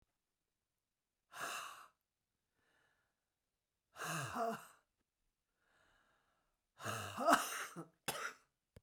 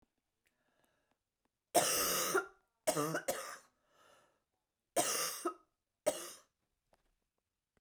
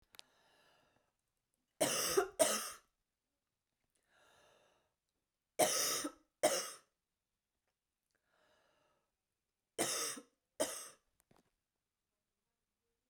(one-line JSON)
{"exhalation_length": "8.8 s", "exhalation_amplitude": 5250, "exhalation_signal_mean_std_ratio": 0.32, "cough_length": "7.8 s", "cough_amplitude": 6133, "cough_signal_mean_std_ratio": 0.38, "three_cough_length": "13.1 s", "three_cough_amplitude": 5165, "three_cough_signal_mean_std_ratio": 0.3, "survey_phase": "beta (2021-08-13 to 2022-03-07)", "age": "45-64", "gender": "Female", "wearing_mask": "No", "symptom_none": true, "symptom_onset": "4 days", "smoker_status": "Ex-smoker", "respiratory_condition_asthma": false, "respiratory_condition_other": false, "recruitment_source": "REACT", "submission_delay": "6 days", "covid_test_result": "Negative", "covid_test_method": "RT-qPCR", "influenza_a_test_result": "Negative", "influenza_b_test_result": "Negative"}